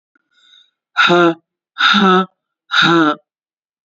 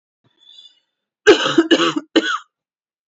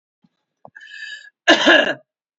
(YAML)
exhalation_length: 3.8 s
exhalation_amplitude: 30277
exhalation_signal_mean_std_ratio: 0.51
three_cough_length: 3.1 s
three_cough_amplitude: 28942
three_cough_signal_mean_std_ratio: 0.38
cough_length: 2.4 s
cough_amplitude: 28661
cough_signal_mean_std_ratio: 0.35
survey_phase: beta (2021-08-13 to 2022-03-07)
age: 18-44
gender: Female
wearing_mask: 'No'
symptom_cough_any: true
symptom_runny_or_blocked_nose: true
symptom_headache: true
symptom_change_to_sense_of_smell_or_taste: true
smoker_status: Never smoked
respiratory_condition_asthma: false
respiratory_condition_other: false
recruitment_source: Test and Trace
submission_delay: 2 days
covid_test_result: Positive
covid_test_method: LFT